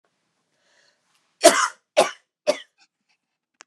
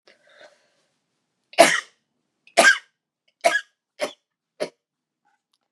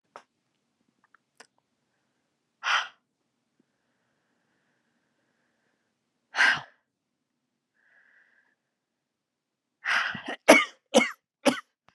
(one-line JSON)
{"cough_length": "3.7 s", "cough_amplitude": 32671, "cough_signal_mean_std_ratio": 0.24, "three_cough_length": "5.7 s", "three_cough_amplitude": 32768, "three_cough_signal_mean_std_ratio": 0.24, "exhalation_length": "11.9 s", "exhalation_amplitude": 29906, "exhalation_signal_mean_std_ratio": 0.22, "survey_phase": "beta (2021-08-13 to 2022-03-07)", "age": "18-44", "gender": "Female", "wearing_mask": "No", "symptom_cough_any": true, "symptom_new_continuous_cough": true, "symptom_runny_or_blocked_nose": true, "symptom_shortness_of_breath": true, "symptom_sore_throat": true, "symptom_abdominal_pain": true, "symptom_fatigue": true, "symptom_headache": true, "symptom_change_to_sense_of_smell_or_taste": true, "symptom_onset": "3 days", "smoker_status": "Never smoked", "respiratory_condition_asthma": false, "respiratory_condition_other": false, "recruitment_source": "Test and Trace", "submission_delay": "1 day", "covid_test_result": "Positive", "covid_test_method": "RT-qPCR", "covid_ct_value": 15.4, "covid_ct_gene": "N gene"}